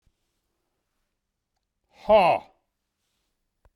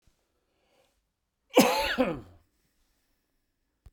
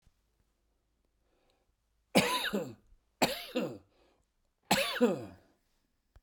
{"exhalation_length": "3.8 s", "exhalation_amplitude": 14286, "exhalation_signal_mean_std_ratio": 0.23, "cough_length": "3.9 s", "cough_amplitude": 18767, "cough_signal_mean_std_ratio": 0.28, "three_cough_length": "6.2 s", "three_cough_amplitude": 11448, "three_cough_signal_mean_std_ratio": 0.34, "survey_phase": "beta (2021-08-13 to 2022-03-07)", "age": "65+", "gender": "Male", "wearing_mask": "No", "symptom_cough_any": true, "symptom_shortness_of_breath": true, "symptom_sore_throat": true, "symptom_fatigue": true, "symptom_change_to_sense_of_smell_or_taste": true, "symptom_onset": "2 days", "smoker_status": "Ex-smoker", "respiratory_condition_asthma": false, "respiratory_condition_other": false, "recruitment_source": "Test and Trace", "submission_delay": "1 day", "covid_test_result": "Positive", "covid_test_method": "RT-qPCR", "covid_ct_value": 11.7, "covid_ct_gene": "ORF1ab gene"}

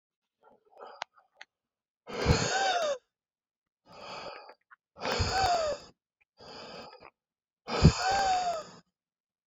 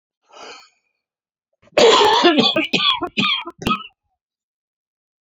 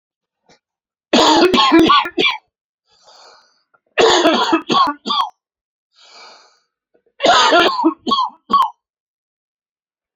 {"exhalation_length": "9.5 s", "exhalation_amplitude": 14632, "exhalation_signal_mean_std_ratio": 0.43, "cough_length": "5.2 s", "cough_amplitude": 28891, "cough_signal_mean_std_ratio": 0.45, "three_cough_length": "10.2 s", "three_cough_amplitude": 32589, "three_cough_signal_mean_std_ratio": 0.49, "survey_phase": "beta (2021-08-13 to 2022-03-07)", "age": "45-64", "gender": "Male", "wearing_mask": "No", "symptom_cough_any": true, "symptom_new_continuous_cough": true, "symptom_runny_or_blocked_nose": true, "symptom_shortness_of_breath": true, "symptom_sore_throat": true, "symptom_diarrhoea": true, "symptom_fatigue": true, "symptom_fever_high_temperature": true, "symptom_headache": true, "symptom_change_to_sense_of_smell_or_taste": true, "symptom_loss_of_taste": true, "symptom_other": true, "symptom_onset": "3 days", "smoker_status": "Ex-smoker", "respiratory_condition_asthma": false, "respiratory_condition_other": false, "recruitment_source": "Test and Trace", "submission_delay": "3 days", "covid_test_method": "RT-qPCR"}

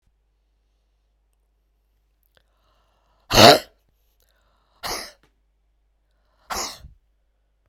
{"exhalation_length": "7.7 s", "exhalation_amplitude": 32768, "exhalation_signal_mean_std_ratio": 0.18, "survey_phase": "beta (2021-08-13 to 2022-03-07)", "age": "65+", "gender": "Female", "wearing_mask": "No", "symptom_cough_any": true, "symptom_runny_or_blocked_nose": true, "symptom_fatigue": true, "symptom_change_to_sense_of_smell_or_taste": true, "smoker_status": "Never smoked", "respiratory_condition_asthma": true, "respiratory_condition_other": false, "recruitment_source": "Test and Trace", "submission_delay": "2 days", "covid_test_result": "Positive", "covid_test_method": "LFT"}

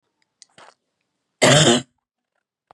{"cough_length": "2.7 s", "cough_amplitude": 31378, "cough_signal_mean_std_ratio": 0.31, "survey_phase": "beta (2021-08-13 to 2022-03-07)", "age": "18-44", "gender": "Female", "wearing_mask": "No", "symptom_runny_or_blocked_nose": true, "symptom_sore_throat": true, "smoker_status": "Never smoked", "respiratory_condition_asthma": false, "respiratory_condition_other": false, "recruitment_source": "REACT", "submission_delay": "1 day", "covid_test_result": "Negative", "covid_test_method": "RT-qPCR", "influenza_a_test_result": "Negative", "influenza_b_test_result": "Negative"}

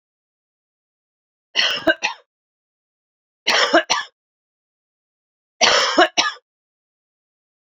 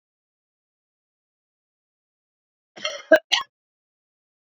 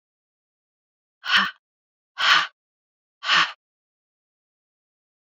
{"three_cough_length": "7.7 s", "three_cough_amplitude": 29188, "three_cough_signal_mean_std_ratio": 0.33, "cough_length": "4.5 s", "cough_amplitude": 27029, "cough_signal_mean_std_ratio": 0.15, "exhalation_length": "5.3 s", "exhalation_amplitude": 21607, "exhalation_signal_mean_std_ratio": 0.29, "survey_phase": "beta (2021-08-13 to 2022-03-07)", "age": "45-64", "gender": "Female", "wearing_mask": "No", "symptom_cough_any": true, "symptom_runny_or_blocked_nose": true, "symptom_diarrhoea": true, "symptom_fatigue": true, "symptom_fever_high_temperature": true, "symptom_onset": "4 days", "smoker_status": "Never smoked", "respiratory_condition_asthma": false, "respiratory_condition_other": false, "recruitment_source": "Test and Trace", "submission_delay": "2 days", "covid_test_result": "Positive", "covid_test_method": "RT-qPCR", "covid_ct_value": 14.2, "covid_ct_gene": "ORF1ab gene"}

